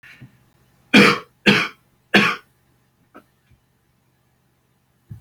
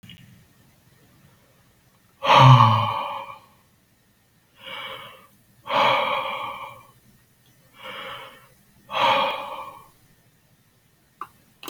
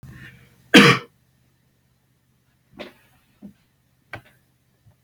{"three_cough_length": "5.2 s", "three_cough_amplitude": 32767, "three_cough_signal_mean_std_ratio": 0.28, "exhalation_length": "11.7 s", "exhalation_amplitude": 28340, "exhalation_signal_mean_std_ratio": 0.34, "cough_length": "5.0 s", "cough_amplitude": 32336, "cough_signal_mean_std_ratio": 0.19, "survey_phase": "beta (2021-08-13 to 2022-03-07)", "age": "18-44", "gender": "Male", "wearing_mask": "No", "symptom_runny_or_blocked_nose": true, "symptom_onset": "3 days", "smoker_status": "Never smoked", "respiratory_condition_asthma": false, "respiratory_condition_other": false, "recruitment_source": "REACT", "submission_delay": "1 day", "covid_test_result": "Negative", "covid_test_method": "RT-qPCR", "covid_ct_value": 40.0, "covid_ct_gene": "N gene"}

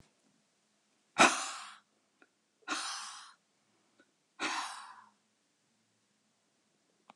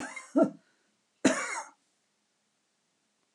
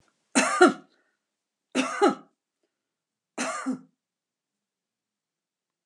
{"exhalation_length": "7.2 s", "exhalation_amplitude": 10774, "exhalation_signal_mean_std_ratio": 0.25, "cough_length": "3.3 s", "cough_amplitude": 9098, "cough_signal_mean_std_ratio": 0.29, "three_cough_length": "5.9 s", "three_cough_amplitude": 20677, "three_cough_signal_mean_std_ratio": 0.29, "survey_phase": "alpha (2021-03-01 to 2021-08-12)", "age": "65+", "gender": "Female", "wearing_mask": "No", "symptom_none": true, "smoker_status": "Ex-smoker", "respiratory_condition_asthma": false, "respiratory_condition_other": false, "recruitment_source": "REACT", "submission_delay": "1 day", "covid_test_result": "Negative", "covid_test_method": "RT-qPCR"}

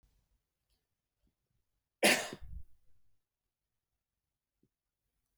{"cough_length": "5.4 s", "cough_amplitude": 7255, "cough_signal_mean_std_ratio": 0.19, "survey_phase": "beta (2021-08-13 to 2022-03-07)", "age": "45-64", "gender": "Male", "wearing_mask": "No", "symptom_none": true, "symptom_onset": "12 days", "smoker_status": "Never smoked", "respiratory_condition_asthma": false, "respiratory_condition_other": false, "recruitment_source": "REACT", "submission_delay": "2 days", "covid_test_result": "Negative", "covid_test_method": "RT-qPCR"}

